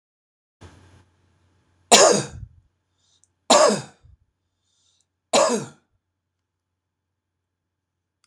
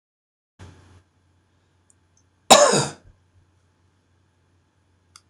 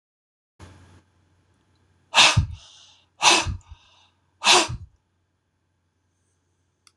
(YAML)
three_cough_length: 8.3 s
three_cough_amplitude: 26028
three_cough_signal_mean_std_ratio: 0.26
cough_length: 5.3 s
cough_amplitude: 26028
cough_signal_mean_std_ratio: 0.2
exhalation_length: 7.0 s
exhalation_amplitude: 25945
exhalation_signal_mean_std_ratio: 0.28
survey_phase: beta (2021-08-13 to 2022-03-07)
age: 65+
gender: Male
wearing_mask: 'No'
symptom_cough_any: true
symptom_runny_or_blocked_nose: true
symptom_sore_throat: true
smoker_status: Ex-smoker
respiratory_condition_asthma: false
respiratory_condition_other: false
recruitment_source: REACT
submission_delay: 9 days
covid_test_result: Negative
covid_test_method: RT-qPCR
influenza_a_test_result: Negative
influenza_b_test_result: Negative